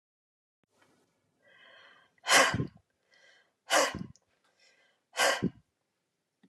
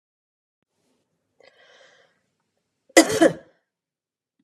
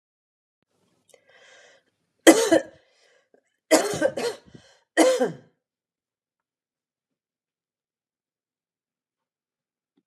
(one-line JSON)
{"exhalation_length": "6.5 s", "exhalation_amplitude": 11297, "exhalation_signal_mean_std_ratio": 0.29, "cough_length": "4.4 s", "cough_amplitude": 32767, "cough_signal_mean_std_ratio": 0.19, "three_cough_length": "10.1 s", "three_cough_amplitude": 32280, "three_cough_signal_mean_std_ratio": 0.24, "survey_phase": "beta (2021-08-13 to 2022-03-07)", "age": "65+", "gender": "Female", "wearing_mask": "No", "symptom_other": true, "symptom_onset": "2 days", "smoker_status": "Never smoked", "respiratory_condition_asthma": false, "respiratory_condition_other": false, "recruitment_source": "Test and Trace", "submission_delay": "1 day", "covid_test_result": "Positive", "covid_test_method": "LAMP"}